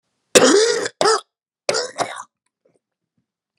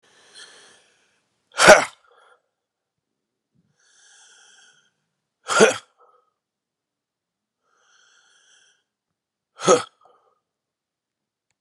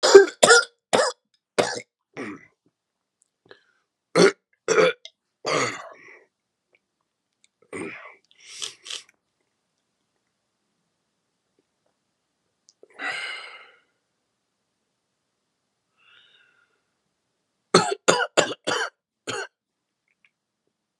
{"cough_length": "3.6 s", "cough_amplitude": 32768, "cough_signal_mean_std_ratio": 0.4, "exhalation_length": "11.6 s", "exhalation_amplitude": 32768, "exhalation_signal_mean_std_ratio": 0.17, "three_cough_length": "21.0 s", "three_cough_amplitude": 32768, "three_cough_signal_mean_std_ratio": 0.24, "survey_phase": "beta (2021-08-13 to 2022-03-07)", "age": "45-64", "gender": "Male", "wearing_mask": "No", "symptom_cough_any": true, "symptom_runny_or_blocked_nose": true, "symptom_shortness_of_breath": true, "symptom_sore_throat": true, "symptom_fatigue": true, "symptom_fever_high_temperature": true, "symptom_headache": true, "symptom_change_to_sense_of_smell_or_taste": true, "symptom_loss_of_taste": true, "symptom_onset": "4 days", "smoker_status": "Never smoked", "respiratory_condition_asthma": false, "respiratory_condition_other": false, "recruitment_source": "Test and Trace", "submission_delay": "1 day", "covid_test_result": "Positive", "covid_test_method": "RT-qPCR"}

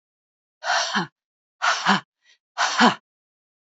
{"exhalation_length": "3.7 s", "exhalation_amplitude": 23857, "exhalation_signal_mean_std_ratio": 0.41, "survey_phase": "beta (2021-08-13 to 2022-03-07)", "age": "18-44", "gender": "Female", "wearing_mask": "No", "symptom_cough_any": true, "symptom_runny_or_blocked_nose": true, "symptom_fatigue": true, "smoker_status": "Current smoker (11 or more cigarettes per day)", "respiratory_condition_asthma": false, "respiratory_condition_other": false, "recruitment_source": "REACT", "submission_delay": "3 days", "covid_test_result": "Negative", "covid_test_method": "RT-qPCR", "influenza_a_test_result": "Unknown/Void", "influenza_b_test_result": "Unknown/Void"}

